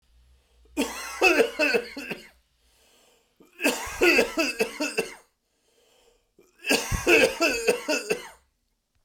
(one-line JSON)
{"three_cough_length": "9.0 s", "three_cough_amplitude": 17225, "three_cough_signal_mean_std_ratio": 0.47, "survey_phase": "beta (2021-08-13 to 2022-03-07)", "age": "45-64", "gender": "Male", "wearing_mask": "No", "symptom_none": true, "smoker_status": "Ex-smoker", "respiratory_condition_asthma": false, "respiratory_condition_other": false, "recruitment_source": "REACT", "submission_delay": "2 days", "covid_test_result": "Negative", "covid_test_method": "RT-qPCR"}